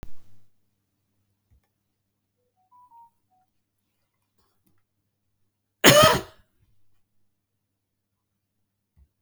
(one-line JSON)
{"cough_length": "9.2 s", "cough_amplitude": 32766, "cough_signal_mean_std_ratio": 0.18, "survey_phase": "beta (2021-08-13 to 2022-03-07)", "age": "65+", "gender": "Male", "wearing_mask": "No", "symptom_none": true, "smoker_status": "Ex-smoker", "respiratory_condition_asthma": false, "respiratory_condition_other": false, "recruitment_source": "REACT", "submission_delay": "6 days", "covid_test_result": "Negative", "covid_test_method": "RT-qPCR", "influenza_a_test_result": "Negative", "influenza_b_test_result": "Negative"}